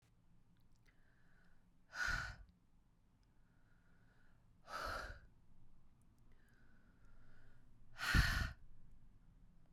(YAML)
exhalation_length: 9.7 s
exhalation_amplitude: 3030
exhalation_signal_mean_std_ratio: 0.38
survey_phase: beta (2021-08-13 to 2022-03-07)
age: 18-44
gender: Female
wearing_mask: 'No'
symptom_cough_any: true
symptom_runny_or_blocked_nose: true
symptom_shortness_of_breath: true
symptom_headache: true
symptom_change_to_sense_of_smell_or_taste: true
symptom_loss_of_taste: true
smoker_status: Ex-smoker
respiratory_condition_asthma: false
respiratory_condition_other: false
recruitment_source: Test and Trace
submission_delay: 3 days
covid_test_result: Positive
covid_test_method: RT-qPCR